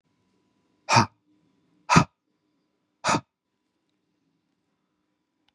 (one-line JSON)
{"exhalation_length": "5.5 s", "exhalation_amplitude": 27235, "exhalation_signal_mean_std_ratio": 0.21, "survey_phase": "beta (2021-08-13 to 2022-03-07)", "age": "18-44", "gender": "Male", "wearing_mask": "No", "symptom_none": true, "smoker_status": "Ex-smoker", "respiratory_condition_asthma": false, "respiratory_condition_other": false, "recruitment_source": "Test and Trace", "submission_delay": "2 days", "covid_test_result": "Positive", "covid_test_method": "RT-qPCR", "covid_ct_value": 22.6, "covid_ct_gene": "ORF1ab gene", "covid_ct_mean": 22.7, "covid_viral_load": "36000 copies/ml", "covid_viral_load_category": "Low viral load (10K-1M copies/ml)"}